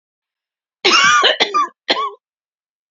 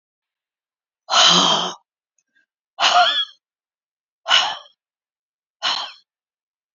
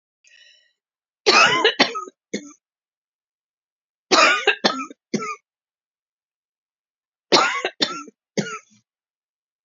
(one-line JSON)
{"cough_length": "2.9 s", "cough_amplitude": 30258, "cough_signal_mean_std_ratio": 0.48, "exhalation_length": "6.7 s", "exhalation_amplitude": 28776, "exhalation_signal_mean_std_ratio": 0.38, "three_cough_length": "9.6 s", "three_cough_amplitude": 31364, "three_cough_signal_mean_std_ratio": 0.34, "survey_phase": "beta (2021-08-13 to 2022-03-07)", "age": "45-64", "gender": "Female", "wearing_mask": "No", "symptom_none": true, "smoker_status": "Ex-smoker", "respiratory_condition_asthma": true, "respiratory_condition_other": false, "recruitment_source": "REACT", "submission_delay": "1 day", "covid_test_result": "Negative", "covid_test_method": "RT-qPCR", "influenza_a_test_result": "Negative", "influenza_b_test_result": "Negative"}